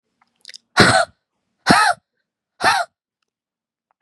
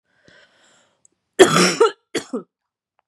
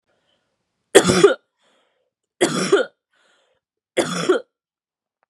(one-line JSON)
{"exhalation_length": "4.0 s", "exhalation_amplitude": 32768, "exhalation_signal_mean_std_ratio": 0.35, "cough_length": "3.1 s", "cough_amplitude": 32768, "cough_signal_mean_std_ratio": 0.31, "three_cough_length": "5.3 s", "three_cough_amplitude": 32768, "three_cough_signal_mean_std_ratio": 0.33, "survey_phase": "beta (2021-08-13 to 2022-03-07)", "age": "18-44", "gender": "Female", "wearing_mask": "No", "symptom_cough_any": true, "smoker_status": "Never smoked", "respiratory_condition_asthma": false, "respiratory_condition_other": false, "recruitment_source": "Test and Trace", "submission_delay": "2 days", "covid_test_result": "Positive", "covid_test_method": "ePCR"}